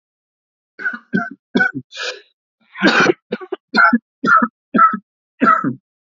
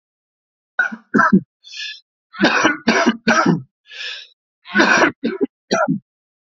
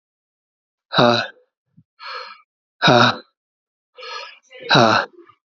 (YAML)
cough_length: 6.1 s
cough_amplitude: 28120
cough_signal_mean_std_ratio: 0.46
three_cough_length: 6.5 s
three_cough_amplitude: 28862
three_cough_signal_mean_std_ratio: 0.5
exhalation_length: 5.5 s
exhalation_amplitude: 28738
exhalation_signal_mean_std_ratio: 0.35
survey_phase: alpha (2021-03-01 to 2021-08-12)
age: 45-64
gender: Male
wearing_mask: 'No'
symptom_cough_any: true
symptom_abdominal_pain: true
symptom_diarrhoea: true
symptom_fatigue: true
symptom_fever_high_temperature: true
symptom_headache: true
symptom_onset: 3 days
smoker_status: Ex-smoker
respiratory_condition_asthma: false
respiratory_condition_other: false
recruitment_source: Test and Trace
submission_delay: 1 day
covid_test_result: Positive
covid_test_method: RT-qPCR
covid_ct_value: 11.8
covid_ct_gene: ORF1ab gene
covid_ct_mean: 12.4
covid_viral_load: 87000000 copies/ml
covid_viral_load_category: High viral load (>1M copies/ml)